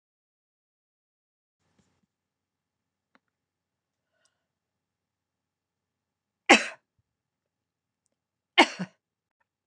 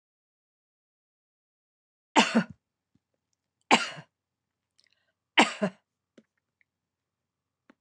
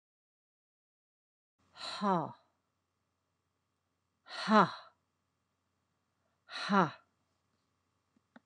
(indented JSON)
{
  "cough_length": "9.7 s",
  "cough_amplitude": 26028,
  "cough_signal_mean_std_ratio": 0.11,
  "three_cough_length": "7.8 s",
  "three_cough_amplitude": 22042,
  "three_cough_signal_mean_std_ratio": 0.2,
  "exhalation_length": "8.5 s",
  "exhalation_amplitude": 8587,
  "exhalation_signal_mean_std_ratio": 0.23,
  "survey_phase": "beta (2021-08-13 to 2022-03-07)",
  "age": "65+",
  "gender": "Female",
  "wearing_mask": "No",
  "symptom_none": true,
  "smoker_status": "Never smoked",
  "respiratory_condition_asthma": false,
  "respiratory_condition_other": false,
  "recruitment_source": "REACT",
  "submission_delay": "4 days",
  "covid_test_result": "Negative",
  "covid_test_method": "RT-qPCR",
  "influenza_a_test_result": "Unknown/Void",
  "influenza_b_test_result": "Unknown/Void"
}